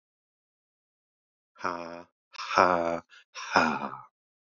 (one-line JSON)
{"exhalation_length": "4.4 s", "exhalation_amplitude": 19973, "exhalation_signal_mean_std_ratio": 0.34, "survey_phase": "beta (2021-08-13 to 2022-03-07)", "age": "18-44", "gender": "Male", "wearing_mask": "No", "symptom_none": true, "symptom_onset": "12 days", "smoker_status": "Never smoked", "respiratory_condition_asthma": false, "respiratory_condition_other": false, "recruitment_source": "REACT", "submission_delay": "2 days", "covid_test_result": "Negative", "covid_test_method": "RT-qPCR", "influenza_a_test_result": "Negative", "influenza_b_test_result": "Negative"}